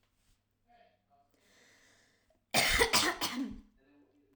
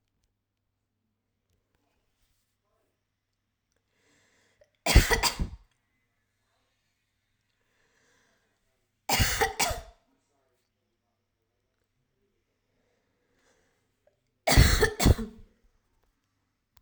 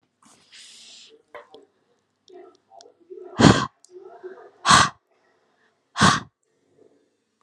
cough_length: 4.4 s
cough_amplitude: 8112
cough_signal_mean_std_ratio: 0.36
three_cough_length: 16.8 s
three_cough_amplitude: 20743
three_cough_signal_mean_std_ratio: 0.23
exhalation_length: 7.4 s
exhalation_amplitude: 32768
exhalation_signal_mean_std_ratio: 0.25
survey_phase: alpha (2021-03-01 to 2021-08-12)
age: 18-44
gender: Female
wearing_mask: 'No'
symptom_none: true
smoker_status: Never smoked
respiratory_condition_asthma: false
respiratory_condition_other: false
recruitment_source: REACT
submission_delay: 10 days
covid_test_result: Negative
covid_test_method: RT-qPCR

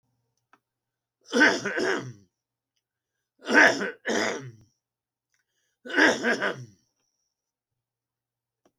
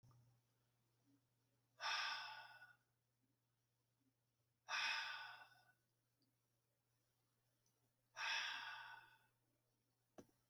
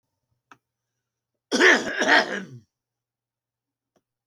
three_cough_length: 8.8 s
three_cough_amplitude: 22365
three_cough_signal_mean_std_ratio: 0.34
exhalation_length: 10.5 s
exhalation_amplitude: 773
exhalation_signal_mean_std_ratio: 0.37
cough_length: 4.3 s
cough_amplitude: 24225
cough_signal_mean_std_ratio: 0.31
survey_phase: beta (2021-08-13 to 2022-03-07)
age: 65+
gender: Male
wearing_mask: 'No'
symptom_none: true
smoker_status: Ex-smoker
respiratory_condition_asthma: false
respiratory_condition_other: false
recruitment_source: REACT
submission_delay: 0 days
covid_test_result: Negative
covid_test_method: RT-qPCR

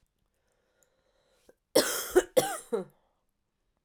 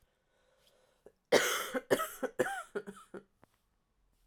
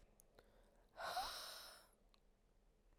cough_length: 3.8 s
cough_amplitude: 13661
cough_signal_mean_std_ratio: 0.29
three_cough_length: 4.3 s
three_cough_amplitude: 8184
three_cough_signal_mean_std_ratio: 0.35
exhalation_length: 3.0 s
exhalation_amplitude: 650
exhalation_signal_mean_std_ratio: 0.48
survey_phase: alpha (2021-03-01 to 2021-08-12)
age: 18-44
gender: Female
wearing_mask: 'No'
symptom_cough_any: true
symptom_new_continuous_cough: true
symptom_shortness_of_breath: true
symptom_abdominal_pain: true
symptom_fatigue: true
symptom_headache: true
smoker_status: Current smoker (1 to 10 cigarettes per day)
respiratory_condition_asthma: false
respiratory_condition_other: false
recruitment_source: Test and Trace
submission_delay: 1 day
covid_test_result: Positive
covid_test_method: RT-qPCR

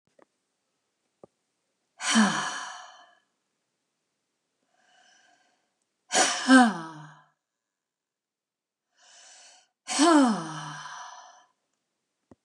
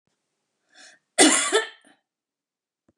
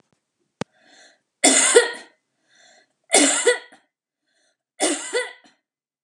exhalation_length: 12.4 s
exhalation_amplitude: 18878
exhalation_signal_mean_std_ratio: 0.29
cough_length: 3.0 s
cough_amplitude: 28256
cough_signal_mean_std_ratio: 0.29
three_cough_length: 6.0 s
three_cough_amplitude: 32012
three_cough_signal_mean_std_ratio: 0.35
survey_phase: beta (2021-08-13 to 2022-03-07)
age: 65+
gender: Female
wearing_mask: 'No'
symptom_none: true
smoker_status: Ex-smoker
respiratory_condition_asthma: false
respiratory_condition_other: true
recruitment_source: REACT
submission_delay: 1 day
covid_test_result: Negative
covid_test_method: RT-qPCR
influenza_a_test_result: Negative
influenza_b_test_result: Negative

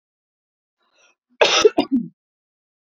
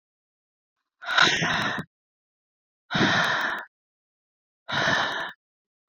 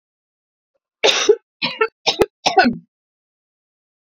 cough_length: 2.8 s
cough_amplitude: 29783
cough_signal_mean_std_ratio: 0.3
exhalation_length: 5.9 s
exhalation_amplitude: 19259
exhalation_signal_mean_std_ratio: 0.47
three_cough_length: 4.0 s
three_cough_amplitude: 27968
three_cough_signal_mean_std_ratio: 0.35
survey_phase: beta (2021-08-13 to 2022-03-07)
age: 18-44
gender: Female
wearing_mask: 'No'
symptom_headache: true
smoker_status: Never smoked
respiratory_condition_asthma: false
respiratory_condition_other: false
recruitment_source: Test and Trace
submission_delay: 2 days
covid_test_result: Positive
covid_test_method: RT-qPCR
covid_ct_value: 31.5
covid_ct_gene: N gene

